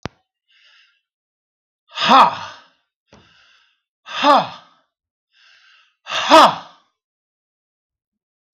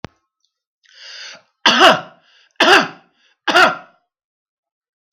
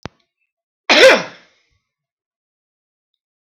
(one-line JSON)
{"exhalation_length": "8.5 s", "exhalation_amplitude": 32768, "exhalation_signal_mean_std_ratio": 0.27, "three_cough_length": "5.1 s", "three_cough_amplitude": 32768, "three_cough_signal_mean_std_ratio": 0.34, "cough_length": "3.4 s", "cough_amplitude": 32768, "cough_signal_mean_std_ratio": 0.25, "survey_phase": "beta (2021-08-13 to 2022-03-07)", "age": "65+", "gender": "Male", "wearing_mask": "No", "symptom_cough_any": true, "smoker_status": "Ex-smoker", "respiratory_condition_asthma": false, "respiratory_condition_other": false, "recruitment_source": "REACT", "submission_delay": "2 days", "covid_test_result": "Negative", "covid_test_method": "RT-qPCR", "influenza_a_test_result": "Negative", "influenza_b_test_result": "Negative"}